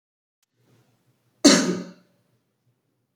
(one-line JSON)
{"cough_length": "3.2 s", "cough_amplitude": 27492, "cough_signal_mean_std_ratio": 0.24, "survey_phase": "beta (2021-08-13 to 2022-03-07)", "age": "18-44", "gender": "Male", "wearing_mask": "No", "symptom_cough_any": true, "symptom_runny_or_blocked_nose": true, "symptom_fever_high_temperature": true, "smoker_status": "Never smoked", "respiratory_condition_asthma": false, "respiratory_condition_other": false, "recruitment_source": "Test and Trace", "submission_delay": "2 days", "covid_test_result": "Positive", "covid_test_method": "RT-qPCR", "covid_ct_value": 27.8, "covid_ct_gene": "ORF1ab gene", "covid_ct_mean": 29.0, "covid_viral_load": "300 copies/ml", "covid_viral_load_category": "Minimal viral load (< 10K copies/ml)"}